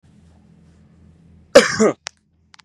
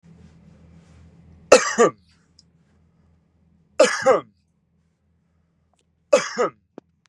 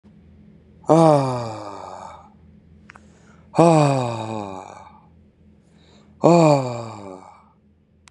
{"cough_length": "2.6 s", "cough_amplitude": 32768, "cough_signal_mean_std_ratio": 0.25, "three_cough_length": "7.1 s", "three_cough_amplitude": 32768, "three_cough_signal_mean_std_ratio": 0.27, "exhalation_length": "8.1 s", "exhalation_amplitude": 32197, "exhalation_signal_mean_std_ratio": 0.37, "survey_phase": "beta (2021-08-13 to 2022-03-07)", "age": "18-44", "gender": "Male", "wearing_mask": "No", "symptom_none": true, "smoker_status": "Never smoked", "respiratory_condition_asthma": false, "respiratory_condition_other": false, "recruitment_source": "REACT", "submission_delay": "1 day", "covid_test_result": "Negative", "covid_test_method": "RT-qPCR", "influenza_a_test_result": "Negative", "influenza_b_test_result": "Negative"}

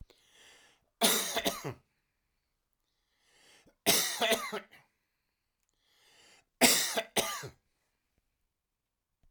{"three_cough_length": "9.3 s", "three_cough_amplitude": 13027, "three_cough_signal_mean_std_ratio": 0.33, "survey_phase": "alpha (2021-03-01 to 2021-08-12)", "age": "65+", "gender": "Male", "wearing_mask": "No", "symptom_none": true, "smoker_status": "Ex-smoker", "respiratory_condition_asthma": false, "respiratory_condition_other": true, "recruitment_source": "REACT", "submission_delay": "4 days", "covid_test_result": "Negative", "covid_test_method": "RT-qPCR"}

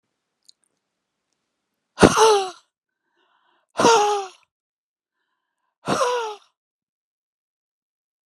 {"exhalation_length": "8.3 s", "exhalation_amplitude": 32768, "exhalation_signal_mean_std_ratio": 0.3, "survey_phase": "alpha (2021-03-01 to 2021-08-12)", "age": "45-64", "gender": "Female", "wearing_mask": "No", "symptom_none": true, "smoker_status": "Never smoked", "respiratory_condition_asthma": false, "respiratory_condition_other": false, "recruitment_source": "REACT", "submission_delay": "3 days", "covid_test_result": "Negative", "covid_test_method": "RT-qPCR"}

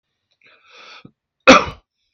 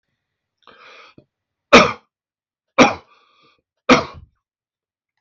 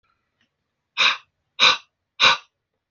{"cough_length": "2.1 s", "cough_amplitude": 32768, "cough_signal_mean_std_ratio": 0.23, "three_cough_length": "5.2 s", "three_cough_amplitude": 32768, "three_cough_signal_mean_std_ratio": 0.23, "exhalation_length": "2.9 s", "exhalation_amplitude": 32294, "exhalation_signal_mean_std_ratio": 0.32, "survey_phase": "beta (2021-08-13 to 2022-03-07)", "age": "18-44", "gender": "Male", "wearing_mask": "No", "symptom_cough_any": true, "symptom_runny_or_blocked_nose": true, "symptom_sore_throat": true, "symptom_headache": true, "smoker_status": "Ex-smoker", "respiratory_condition_asthma": false, "respiratory_condition_other": false, "recruitment_source": "REACT", "submission_delay": "1 day", "covid_test_result": "Positive", "covid_test_method": "RT-qPCR", "covid_ct_value": 27.0, "covid_ct_gene": "E gene", "influenza_a_test_result": "Negative", "influenza_b_test_result": "Negative"}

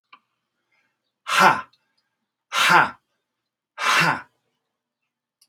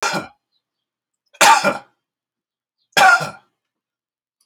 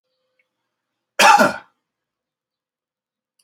{"exhalation_length": "5.5 s", "exhalation_amplitude": 28309, "exhalation_signal_mean_std_ratio": 0.33, "three_cough_length": "4.5 s", "three_cough_amplitude": 32768, "three_cough_signal_mean_std_ratio": 0.32, "cough_length": "3.4 s", "cough_amplitude": 28525, "cough_signal_mean_std_ratio": 0.25, "survey_phase": "alpha (2021-03-01 to 2021-08-12)", "age": "45-64", "gender": "Male", "wearing_mask": "No", "symptom_none": true, "smoker_status": "Ex-smoker", "respiratory_condition_asthma": false, "respiratory_condition_other": false, "recruitment_source": "REACT", "submission_delay": "2 days", "covid_test_result": "Negative", "covid_test_method": "RT-qPCR"}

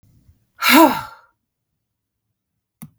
{"exhalation_length": "3.0 s", "exhalation_amplitude": 32768, "exhalation_signal_mean_std_ratio": 0.27, "survey_phase": "beta (2021-08-13 to 2022-03-07)", "age": "45-64", "gender": "Female", "wearing_mask": "No", "symptom_cough_any": true, "symptom_onset": "12 days", "smoker_status": "Never smoked", "respiratory_condition_asthma": false, "respiratory_condition_other": false, "recruitment_source": "REACT", "submission_delay": "3 days", "covid_test_result": "Negative", "covid_test_method": "RT-qPCR", "influenza_a_test_result": "Negative", "influenza_b_test_result": "Negative"}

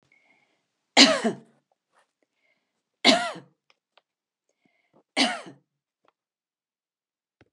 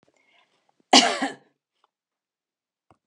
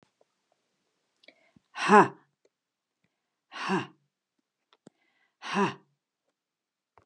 {"three_cough_length": "7.5 s", "three_cough_amplitude": 31405, "three_cough_signal_mean_std_ratio": 0.22, "cough_length": "3.1 s", "cough_amplitude": 31271, "cough_signal_mean_std_ratio": 0.22, "exhalation_length": "7.1 s", "exhalation_amplitude": 19959, "exhalation_signal_mean_std_ratio": 0.21, "survey_phase": "beta (2021-08-13 to 2022-03-07)", "age": "65+", "gender": "Female", "wearing_mask": "No", "symptom_none": true, "smoker_status": "Ex-smoker", "respiratory_condition_asthma": false, "respiratory_condition_other": false, "recruitment_source": "REACT", "submission_delay": "3 days", "covid_test_result": "Negative", "covid_test_method": "RT-qPCR", "influenza_a_test_result": "Negative", "influenza_b_test_result": "Negative"}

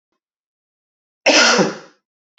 {"cough_length": "2.4 s", "cough_amplitude": 32415, "cough_signal_mean_std_ratio": 0.36, "survey_phase": "beta (2021-08-13 to 2022-03-07)", "age": "45-64", "gender": "Male", "wearing_mask": "No", "symptom_cough_any": true, "symptom_runny_or_blocked_nose": true, "symptom_sore_throat": true, "symptom_fatigue": true, "symptom_headache": true, "symptom_change_to_sense_of_smell_or_taste": true, "smoker_status": "Ex-smoker", "respiratory_condition_asthma": false, "respiratory_condition_other": false, "recruitment_source": "Test and Trace", "submission_delay": "2 days", "covid_test_result": "Positive", "covid_test_method": "RT-qPCR"}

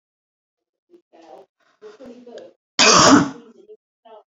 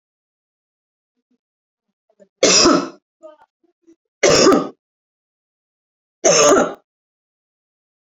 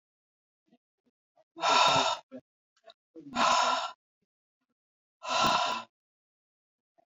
{"cough_length": "4.3 s", "cough_amplitude": 32059, "cough_signal_mean_std_ratio": 0.3, "three_cough_length": "8.2 s", "three_cough_amplitude": 32768, "three_cough_signal_mean_std_ratio": 0.33, "exhalation_length": "7.1 s", "exhalation_amplitude": 8320, "exhalation_signal_mean_std_ratio": 0.4, "survey_phase": "beta (2021-08-13 to 2022-03-07)", "age": "45-64", "gender": "Female", "wearing_mask": "Prefer not to say", "symptom_none": true, "smoker_status": "Never smoked", "respiratory_condition_asthma": false, "respiratory_condition_other": false, "recruitment_source": "REACT", "submission_delay": "2 days", "covid_test_result": "Negative", "covid_test_method": "RT-qPCR", "influenza_a_test_result": "Negative", "influenza_b_test_result": "Negative"}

